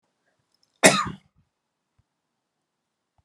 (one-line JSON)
{"cough_length": "3.2 s", "cough_amplitude": 32767, "cough_signal_mean_std_ratio": 0.18, "survey_phase": "alpha (2021-03-01 to 2021-08-12)", "age": "18-44", "gender": "Female", "wearing_mask": "No", "symptom_fatigue": true, "symptom_headache": true, "symptom_onset": "13 days", "smoker_status": "Never smoked", "respiratory_condition_asthma": false, "respiratory_condition_other": false, "recruitment_source": "REACT", "submission_delay": "1 day", "covid_test_result": "Negative", "covid_test_method": "RT-qPCR"}